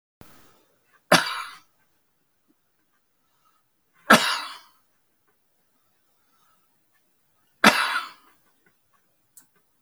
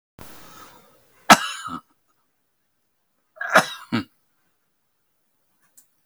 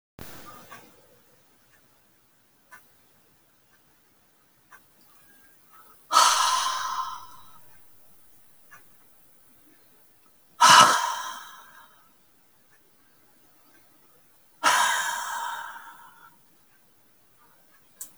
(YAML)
three_cough_length: 9.8 s
three_cough_amplitude: 32768
three_cough_signal_mean_std_ratio: 0.21
cough_length: 6.1 s
cough_amplitude: 32768
cough_signal_mean_std_ratio: 0.2
exhalation_length: 18.2 s
exhalation_amplitude: 30460
exhalation_signal_mean_std_ratio: 0.29
survey_phase: alpha (2021-03-01 to 2021-08-12)
age: 65+
gender: Male
wearing_mask: 'No'
symptom_none: true
smoker_status: Ex-smoker
respiratory_condition_asthma: true
respiratory_condition_other: false
recruitment_source: REACT
submission_delay: 2 days
covid_test_result: Negative
covid_test_method: RT-qPCR